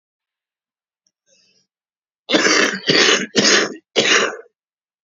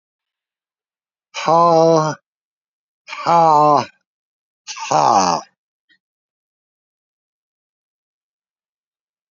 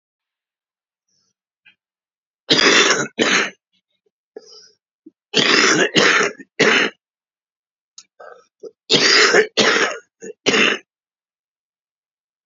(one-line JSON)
{"cough_length": "5.0 s", "cough_amplitude": 32767, "cough_signal_mean_std_ratio": 0.46, "exhalation_length": "9.3 s", "exhalation_amplitude": 29735, "exhalation_signal_mean_std_ratio": 0.35, "three_cough_length": "12.5 s", "three_cough_amplitude": 32768, "three_cough_signal_mean_std_ratio": 0.43, "survey_phase": "beta (2021-08-13 to 2022-03-07)", "age": "45-64", "gender": "Male", "wearing_mask": "No", "symptom_cough_any": true, "symptom_sore_throat": true, "smoker_status": "Ex-smoker", "respiratory_condition_asthma": false, "respiratory_condition_other": false, "recruitment_source": "REACT", "submission_delay": "6 days", "covid_test_result": "Negative", "covid_test_method": "RT-qPCR", "influenza_a_test_result": "Negative", "influenza_b_test_result": "Negative"}